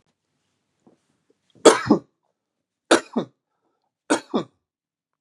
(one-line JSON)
{"three_cough_length": "5.2 s", "three_cough_amplitude": 32768, "three_cough_signal_mean_std_ratio": 0.23, "survey_phase": "beta (2021-08-13 to 2022-03-07)", "age": "45-64", "gender": "Male", "wearing_mask": "No", "symptom_none": true, "smoker_status": "Ex-smoker", "respiratory_condition_asthma": true, "respiratory_condition_other": false, "recruitment_source": "Test and Trace", "submission_delay": "2 days", "covid_test_result": "Negative", "covid_test_method": "ePCR"}